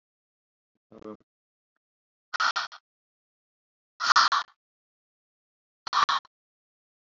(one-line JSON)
{"exhalation_length": "7.1 s", "exhalation_amplitude": 16508, "exhalation_signal_mean_std_ratio": 0.26, "survey_phase": "alpha (2021-03-01 to 2021-08-12)", "age": "45-64", "gender": "Female", "wearing_mask": "No", "symptom_none": true, "smoker_status": "Never smoked", "respiratory_condition_asthma": false, "respiratory_condition_other": false, "recruitment_source": "REACT", "submission_delay": "1 day", "covid_test_result": "Negative", "covid_test_method": "RT-qPCR"}